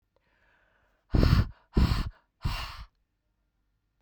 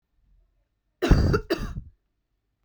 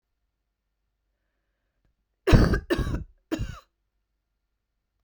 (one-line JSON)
{"exhalation_length": "4.0 s", "exhalation_amplitude": 15027, "exhalation_signal_mean_std_ratio": 0.35, "cough_length": "2.6 s", "cough_amplitude": 19449, "cough_signal_mean_std_ratio": 0.35, "three_cough_length": "5.0 s", "three_cough_amplitude": 24182, "three_cough_signal_mean_std_ratio": 0.26, "survey_phase": "beta (2021-08-13 to 2022-03-07)", "age": "45-64", "gender": "Female", "wearing_mask": "No", "symptom_cough_any": true, "symptom_runny_or_blocked_nose": true, "symptom_change_to_sense_of_smell_or_taste": true, "symptom_loss_of_taste": true, "symptom_onset": "5 days", "smoker_status": "Ex-smoker", "respiratory_condition_asthma": false, "respiratory_condition_other": false, "recruitment_source": "Test and Trace", "submission_delay": "1 day", "covid_test_result": "Positive", "covid_test_method": "RT-qPCR"}